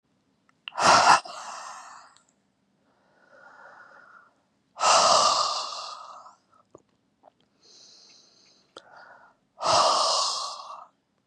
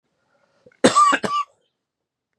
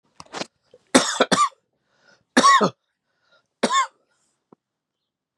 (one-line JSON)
{"exhalation_length": "11.3 s", "exhalation_amplitude": 21843, "exhalation_signal_mean_std_ratio": 0.38, "cough_length": "2.4 s", "cough_amplitude": 32622, "cough_signal_mean_std_ratio": 0.36, "three_cough_length": "5.4 s", "three_cough_amplitude": 32580, "three_cough_signal_mean_std_ratio": 0.33, "survey_phase": "beta (2021-08-13 to 2022-03-07)", "age": "45-64", "gender": "Male", "wearing_mask": "No", "symptom_cough_any": true, "symptom_runny_or_blocked_nose": true, "symptom_sore_throat": true, "symptom_fatigue": true, "symptom_fever_high_temperature": true, "symptom_headache": true, "symptom_onset": "3 days", "smoker_status": "Ex-smoker", "respiratory_condition_asthma": false, "respiratory_condition_other": false, "recruitment_source": "Test and Trace", "submission_delay": "1 day", "covid_test_result": "Positive", "covid_test_method": "ePCR"}